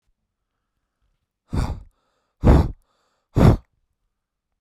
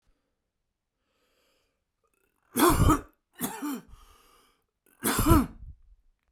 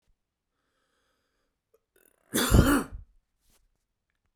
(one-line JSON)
{"exhalation_length": "4.6 s", "exhalation_amplitude": 25862, "exhalation_signal_mean_std_ratio": 0.28, "three_cough_length": "6.3 s", "three_cough_amplitude": 16166, "three_cough_signal_mean_std_ratio": 0.33, "cough_length": "4.4 s", "cough_amplitude": 14575, "cough_signal_mean_std_ratio": 0.26, "survey_phase": "beta (2021-08-13 to 2022-03-07)", "age": "18-44", "gender": "Male", "wearing_mask": "No", "symptom_none": true, "smoker_status": "Never smoked", "respiratory_condition_asthma": false, "respiratory_condition_other": false, "recruitment_source": "REACT", "submission_delay": "1 day", "covid_test_result": "Negative", "covid_test_method": "RT-qPCR"}